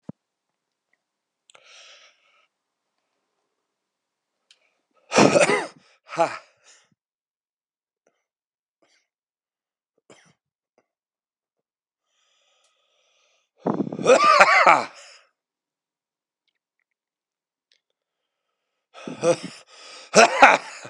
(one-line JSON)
{"exhalation_length": "20.9 s", "exhalation_amplitude": 32768, "exhalation_signal_mean_std_ratio": 0.24, "survey_phase": "beta (2021-08-13 to 2022-03-07)", "age": "45-64", "gender": "Male", "wearing_mask": "No", "symptom_cough_any": true, "symptom_runny_or_blocked_nose": true, "symptom_shortness_of_breath": true, "symptom_abdominal_pain": true, "symptom_fatigue": true, "symptom_fever_high_temperature": true, "symptom_headache": true, "smoker_status": "Never smoked", "respiratory_condition_asthma": false, "respiratory_condition_other": true, "recruitment_source": "Test and Trace", "submission_delay": "2 days", "covid_test_result": "Positive", "covid_test_method": "RT-qPCR", "covid_ct_value": 14.8, "covid_ct_gene": "ORF1ab gene", "covid_ct_mean": 15.1, "covid_viral_load": "11000000 copies/ml", "covid_viral_load_category": "High viral load (>1M copies/ml)"}